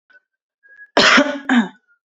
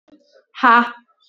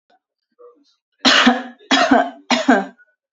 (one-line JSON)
{"cough_length": "2.0 s", "cough_amplitude": 31030, "cough_signal_mean_std_ratio": 0.44, "exhalation_length": "1.3 s", "exhalation_amplitude": 27971, "exhalation_signal_mean_std_ratio": 0.36, "three_cough_length": "3.3 s", "three_cough_amplitude": 30556, "three_cough_signal_mean_std_ratio": 0.46, "survey_phase": "alpha (2021-03-01 to 2021-08-12)", "age": "18-44", "gender": "Female", "wearing_mask": "No", "symptom_cough_any": true, "symptom_fatigue": true, "symptom_onset": "2 days", "smoker_status": "Ex-smoker", "respiratory_condition_asthma": false, "respiratory_condition_other": false, "recruitment_source": "Test and Trace", "submission_delay": "1 day", "covid_test_result": "Positive", "covid_test_method": "RT-qPCR", "covid_ct_value": 20.3, "covid_ct_gene": "ORF1ab gene", "covid_ct_mean": 20.8, "covid_viral_load": "150000 copies/ml", "covid_viral_load_category": "Low viral load (10K-1M copies/ml)"}